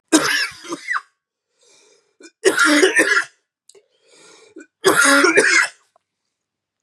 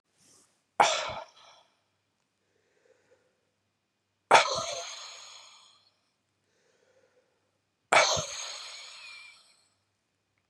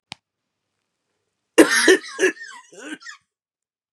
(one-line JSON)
{"three_cough_length": "6.8 s", "three_cough_amplitude": 31897, "three_cough_signal_mean_std_ratio": 0.46, "exhalation_length": "10.5 s", "exhalation_amplitude": 20695, "exhalation_signal_mean_std_ratio": 0.26, "cough_length": "3.9 s", "cough_amplitude": 32768, "cough_signal_mean_std_ratio": 0.29, "survey_phase": "beta (2021-08-13 to 2022-03-07)", "age": "45-64", "gender": "Male", "wearing_mask": "No", "symptom_cough_any": true, "symptom_new_continuous_cough": true, "symptom_runny_or_blocked_nose": true, "symptom_shortness_of_breath": true, "symptom_abdominal_pain": true, "symptom_fatigue": true, "symptom_headache": true, "symptom_change_to_sense_of_smell_or_taste": true, "symptom_loss_of_taste": true, "symptom_onset": "3 days", "smoker_status": "Never smoked", "respiratory_condition_asthma": false, "respiratory_condition_other": false, "recruitment_source": "Test and Trace", "submission_delay": "2 days", "covid_test_result": "Positive", "covid_test_method": "RT-qPCR", "covid_ct_value": 13.5, "covid_ct_gene": "ORF1ab gene", "covid_ct_mean": 14.0, "covid_viral_load": "25000000 copies/ml", "covid_viral_load_category": "High viral load (>1M copies/ml)"}